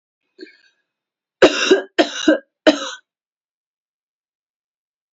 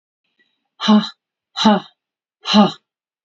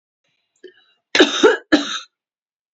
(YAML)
three_cough_length: 5.1 s
three_cough_amplitude: 29596
three_cough_signal_mean_std_ratio: 0.28
exhalation_length: 3.2 s
exhalation_amplitude: 28332
exhalation_signal_mean_std_ratio: 0.37
cough_length: 2.7 s
cough_amplitude: 29397
cough_signal_mean_std_ratio: 0.34
survey_phase: beta (2021-08-13 to 2022-03-07)
age: 18-44
gender: Female
wearing_mask: 'No'
symptom_none: true
smoker_status: Ex-smoker
respiratory_condition_asthma: false
respiratory_condition_other: false
recruitment_source: REACT
submission_delay: 0 days
covid_test_result: Negative
covid_test_method: RT-qPCR